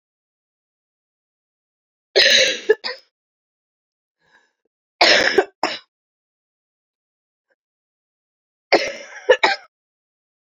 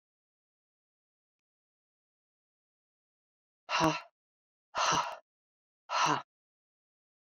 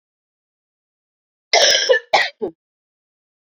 {
  "three_cough_length": "10.4 s",
  "three_cough_amplitude": 31858,
  "three_cough_signal_mean_std_ratio": 0.28,
  "exhalation_length": "7.3 s",
  "exhalation_amplitude": 6654,
  "exhalation_signal_mean_std_ratio": 0.28,
  "cough_length": "3.5 s",
  "cough_amplitude": 31780,
  "cough_signal_mean_std_ratio": 0.34,
  "survey_phase": "beta (2021-08-13 to 2022-03-07)",
  "age": "45-64",
  "gender": "Female",
  "wearing_mask": "No",
  "symptom_cough_any": true,
  "symptom_runny_or_blocked_nose": true,
  "symptom_fatigue": true,
  "symptom_fever_high_temperature": true,
  "symptom_headache": true,
  "symptom_onset": "2 days",
  "smoker_status": "Never smoked",
  "respiratory_condition_asthma": false,
  "respiratory_condition_other": false,
  "recruitment_source": "Test and Trace",
  "submission_delay": "1 day",
  "covid_test_result": "Positive",
  "covid_test_method": "RT-qPCR"
}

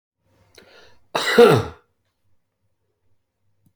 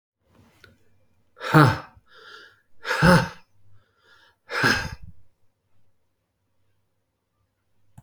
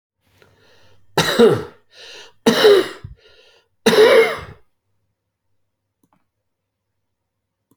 {
  "cough_length": "3.8 s",
  "cough_amplitude": 27998,
  "cough_signal_mean_std_ratio": 0.26,
  "exhalation_length": "8.0 s",
  "exhalation_amplitude": 28088,
  "exhalation_signal_mean_std_ratio": 0.28,
  "three_cough_length": "7.8 s",
  "three_cough_amplitude": 28964,
  "three_cough_signal_mean_std_ratio": 0.34,
  "survey_phase": "beta (2021-08-13 to 2022-03-07)",
  "age": "65+",
  "gender": "Male",
  "wearing_mask": "No",
  "symptom_none": true,
  "smoker_status": "Ex-smoker",
  "respiratory_condition_asthma": false,
  "respiratory_condition_other": false,
  "recruitment_source": "REACT",
  "submission_delay": "8 days",
  "covid_test_result": "Negative",
  "covid_test_method": "RT-qPCR"
}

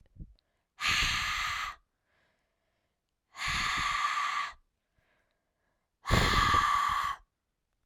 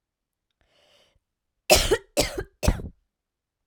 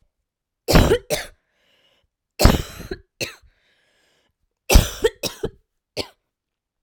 {
  "exhalation_length": "7.9 s",
  "exhalation_amplitude": 8662,
  "exhalation_signal_mean_std_ratio": 0.54,
  "cough_length": "3.7 s",
  "cough_amplitude": 30244,
  "cough_signal_mean_std_ratio": 0.3,
  "three_cough_length": "6.8 s",
  "three_cough_amplitude": 32768,
  "three_cough_signal_mean_std_ratio": 0.28,
  "survey_phase": "beta (2021-08-13 to 2022-03-07)",
  "age": "18-44",
  "gender": "Female",
  "wearing_mask": "No",
  "symptom_cough_any": true,
  "symptom_new_continuous_cough": true,
  "symptom_runny_or_blocked_nose": true,
  "symptom_sore_throat": true,
  "symptom_diarrhoea": true,
  "symptom_fatigue": true,
  "symptom_fever_high_temperature": true,
  "symptom_headache": true,
  "smoker_status": "Prefer not to say",
  "respiratory_condition_asthma": false,
  "respiratory_condition_other": false,
  "recruitment_source": "Test and Trace",
  "submission_delay": "3 days",
  "covid_test_result": "Positive",
  "covid_test_method": "RT-qPCR",
  "covid_ct_value": 23.7,
  "covid_ct_gene": "ORF1ab gene",
  "covid_ct_mean": 24.9,
  "covid_viral_load": "6700 copies/ml",
  "covid_viral_load_category": "Minimal viral load (< 10K copies/ml)"
}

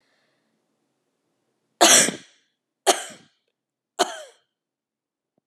{
  "three_cough_length": "5.5 s",
  "three_cough_amplitude": 31262,
  "three_cough_signal_mean_std_ratio": 0.23,
  "survey_phase": "alpha (2021-03-01 to 2021-08-12)",
  "age": "45-64",
  "gender": "Female",
  "wearing_mask": "No",
  "symptom_none": true,
  "smoker_status": "Never smoked",
  "respiratory_condition_asthma": true,
  "respiratory_condition_other": false,
  "recruitment_source": "REACT",
  "submission_delay": "1 day",
  "covid_test_result": "Negative",
  "covid_test_method": "RT-qPCR"
}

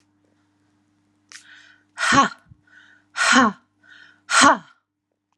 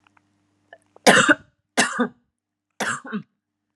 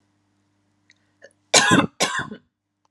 {
  "exhalation_length": "5.4 s",
  "exhalation_amplitude": 30956,
  "exhalation_signal_mean_std_ratio": 0.33,
  "three_cough_length": "3.8 s",
  "three_cough_amplitude": 32700,
  "three_cough_signal_mean_std_ratio": 0.32,
  "cough_length": "2.9 s",
  "cough_amplitude": 32767,
  "cough_signal_mean_std_ratio": 0.33,
  "survey_phase": "alpha (2021-03-01 to 2021-08-12)",
  "age": "18-44",
  "gender": "Female",
  "wearing_mask": "No",
  "symptom_none": true,
  "smoker_status": "Never smoked",
  "respiratory_condition_asthma": false,
  "respiratory_condition_other": false,
  "recruitment_source": "REACT",
  "submission_delay": "3 days",
  "covid_test_result": "Negative",
  "covid_test_method": "RT-qPCR"
}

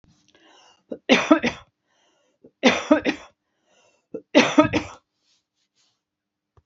{
  "three_cough_length": "6.7 s",
  "three_cough_amplitude": 27583,
  "three_cough_signal_mean_std_ratio": 0.3,
  "survey_phase": "beta (2021-08-13 to 2022-03-07)",
  "age": "65+",
  "gender": "Female",
  "wearing_mask": "No",
  "symptom_none": true,
  "smoker_status": "Never smoked",
  "respiratory_condition_asthma": false,
  "respiratory_condition_other": false,
  "recruitment_source": "Test and Trace",
  "submission_delay": "1 day",
  "covid_test_result": "Negative",
  "covid_test_method": "LFT"
}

